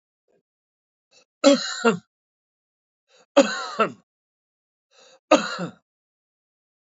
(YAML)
three_cough_length: 6.8 s
three_cough_amplitude: 26725
three_cough_signal_mean_std_ratio: 0.26
survey_phase: beta (2021-08-13 to 2022-03-07)
age: 65+
gender: Male
wearing_mask: 'No'
symptom_cough_any: true
symptom_sore_throat: true
symptom_fatigue: true
symptom_headache: true
smoker_status: Current smoker (e-cigarettes or vapes only)
respiratory_condition_asthma: false
respiratory_condition_other: true
recruitment_source: Test and Trace
submission_delay: 2 days
covid_test_result: Negative
covid_test_method: LFT